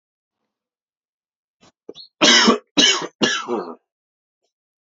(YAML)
three_cough_length: 4.9 s
three_cough_amplitude: 32199
three_cough_signal_mean_std_ratio: 0.35
survey_phase: beta (2021-08-13 to 2022-03-07)
age: 18-44
gender: Male
wearing_mask: 'No'
symptom_runny_or_blocked_nose: true
symptom_other: true
smoker_status: Ex-smoker
respiratory_condition_asthma: false
respiratory_condition_other: false
recruitment_source: Test and Trace
submission_delay: 1 day
covid_test_result: Positive
covid_test_method: RT-qPCR
covid_ct_value: 29.5
covid_ct_gene: ORF1ab gene